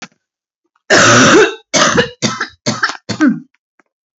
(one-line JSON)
{"cough_length": "4.2 s", "cough_amplitude": 32768, "cough_signal_mean_std_ratio": 0.53, "survey_phase": "beta (2021-08-13 to 2022-03-07)", "age": "18-44", "gender": "Male", "wearing_mask": "No", "symptom_cough_any": true, "symptom_shortness_of_breath": true, "symptom_fatigue": true, "symptom_fever_high_temperature": true, "symptom_headache": true, "smoker_status": "Never smoked", "respiratory_condition_asthma": true, "respiratory_condition_other": false, "recruitment_source": "Test and Trace", "submission_delay": "3 days", "covid_test_result": "Positive", "covid_test_method": "LFT"}